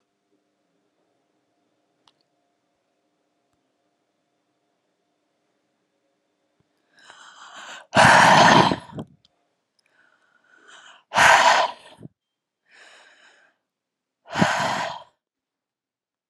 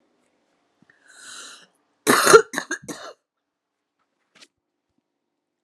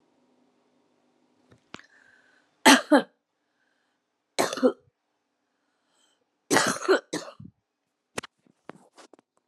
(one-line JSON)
{"exhalation_length": "16.3 s", "exhalation_amplitude": 30165, "exhalation_signal_mean_std_ratio": 0.27, "cough_length": "5.6 s", "cough_amplitude": 32767, "cough_signal_mean_std_ratio": 0.21, "three_cough_length": "9.5 s", "three_cough_amplitude": 26029, "three_cough_signal_mean_std_ratio": 0.23, "survey_phase": "alpha (2021-03-01 to 2021-08-12)", "age": "45-64", "gender": "Female", "wearing_mask": "No", "symptom_cough_any": true, "symptom_new_continuous_cough": true, "symptom_shortness_of_breath": true, "symptom_fatigue": true, "symptom_fever_high_temperature": true, "symptom_headache": true, "symptom_change_to_sense_of_smell_or_taste": true, "symptom_loss_of_taste": true, "symptom_onset": "3 days", "smoker_status": "Ex-smoker", "respiratory_condition_asthma": false, "respiratory_condition_other": false, "recruitment_source": "Test and Trace", "submission_delay": "2 days", "covid_test_result": "Positive", "covid_test_method": "RT-qPCR"}